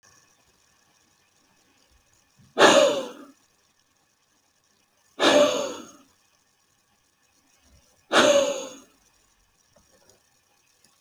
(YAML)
exhalation_length: 11.0 s
exhalation_amplitude: 25241
exhalation_signal_mean_std_ratio: 0.29
survey_phase: alpha (2021-03-01 to 2021-08-12)
age: 45-64
gender: Male
wearing_mask: 'No'
symptom_none: true
smoker_status: Never smoked
respiratory_condition_asthma: false
respiratory_condition_other: false
recruitment_source: REACT
submission_delay: 2 days
covid_test_result: Negative
covid_test_method: RT-qPCR